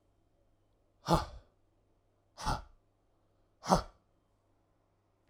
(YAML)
exhalation_length: 5.3 s
exhalation_amplitude: 11987
exhalation_signal_mean_std_ratio: 0.24
survey_phase: alpha (2021-03-01 to 2021-08-12)
age: 45-64
gender: Male
wearing_mask: 'No'
symptom_none: true
smoker_status: Ex-smoker
respiratory_condition_asthma: false
respiratory_condition_other: false
recruitment_source: REACT
submission_delay: 2 days
covid_test_result: Negative
covid_test_method: RT-qPCR